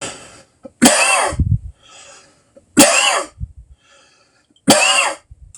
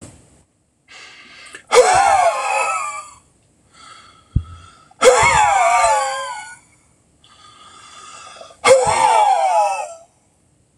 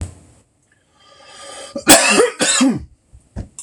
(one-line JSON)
{"three_cough_length": "5.6 s", "three_cough_amplitude": 26028, "three_cough_signal_mean_std_ratio": 0.47, "exhalation_length": "10.8 s", "exhalation_amplitude": 26028, "exhalation_signal_mean_std_ratio": 0.53, "cough_length": "3.6 s", "cough_amplitude": 26028, "cough_signal_mean_std_ratio": 0.43, "survey_phase": "beta (2021-08-13 to 2022-03-07)", "age": "45-64", "gender": "Male", "wearing_mask": "No", "symptom_headache": true, "smoker_status": "Ex-smoker", "respiratory_condition_asthma": false, "respiratory_condition_other": false, "recruitment_source": "REACT", "submission_delay": "1 day", "covid_test_result": "Negative", "covid_test_method": "RT-qPCR", "influenza_a_test_result": "Negative", "influenza_b_test_result": "Negative"}